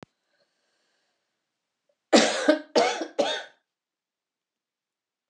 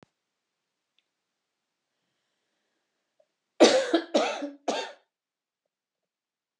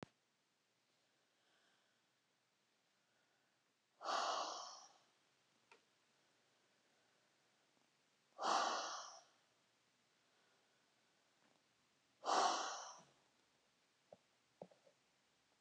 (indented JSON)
{
  "cough_length": "5.3 s",
  "cough_amplitude": 19007,
  "cough_signal_mean_std_ratio": 0.3,
  "three_cough_length": "6.6 s",
  "three_cough_amplitude": 24067,
  "three_cough_signal_mean_std_ratio": 0.25,
  "exhalation_length": "15.6 s",
  "exhalation_amplitude": 1933,
  "exhalation_signal_mean_std_ratio": 0.29,
  "survey_phase": "beta (2021-08-13 to 2022-03-07)",
  "age": "65+",
  "gender": "Female",
  "wearing_mask": "No",
  "symptom_none": true,
  "smoker_status": "Ex-smoker",
  "respiratory_condition_asthma": true,
  "respiratory_condition_other": false,
  "recruitment_source": "REACT",
  "submission_delay": "4 days",
  "covid_test_result": "Negative",
  "covid_test_method": "RT-qPCR"
}